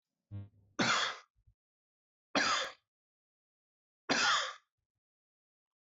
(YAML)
three_cough_length: 5.9 s
three_cough_amplitude: 4316
three_cough_signal_mean_std_ratio: 0.36
survey_phase: beta (2021-08-13 to 2022-03-07)
age: 45-64
gender: Male
wearing_mask: 'No'
symptom_none: true
smoker_status: Never smoked
respiratory_condition_asthma: false
respiratory_condition_other: false
recruitment_source: REACT
submission_delay: 3 days
covid_test_result: Negative
covid_test_method: RT-qPCR
influenza_a_test_result: Negative
influenza_b_test_result: Negative